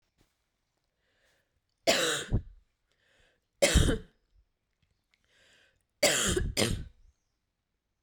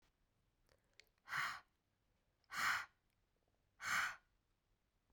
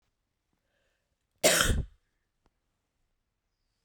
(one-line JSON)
{"three_cough_length": "8.0 s", "three_cough_amplitude": 10196, "three_cough_signal_mean_std_ratio": 0.34, "exhalation_length": "5.1 s", "exhalation_amplitude": 1556, "exhalation_signal_mean_std_ratio": 0.35, "cough_length": "3.8 s", "cough_amplitude": 13334, "cough_signal_mean_std_ratio": 0.25, "survey_phase": "beta (2021-08-13 to 2022-03-07)", "age": "18-44", "gender": "Female", "wearing_mask": "No", "symptom_cough_any": true, "symptom_runny_or_blocked_nose": true, "symptom_shortness_of_breath": true, "symptom_sore_throat": true, "symptom_fatigue": true, "symptom_fever_high_temperature": true, "symptom_headache": true, "symptom_other": true, "smoker_status": "Never smoked", "respiratory_condition_asthma": false, "respiratory_condition_other": false, "recruitment_source": "Test and Trace", "submission_delay": "2 days", "covid_test_result": "Positive", "covid_test_method": "RT-qPCR"}